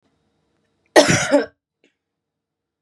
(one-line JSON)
{"cough_length": "2.8 s", "cough_amplitude": 32768, "cough_signal_mean_std_ratio": 0.29, "survey_phase": "beta (2021-08-13 to 2022-03-07)", "age": "18-44", "gender": "Female", "wearing_mask": "No", "symptom_cough_any": true, "symptom_new_continuous_cough": true, "symptom_runny_or_blocked_nose": true, "symptom_shortness_of_breath": true, "symptom_sore_throat": true, "symptom_abdominal_pain": true, "symptom_fatigue": true, "symptom_headache": true, "smoker_status": "Ex-smoker", "respiratory_condition_asthma": true, "respiratory_condition_other": false, "recruitment_source": "REACT", "submission_delay": "4 days", "covid_test_result": "Negative", "covid_test_method": "RT-qPCR", "influenza_a_test_result": "Negative", "influenza_b_test_result": "Negative"}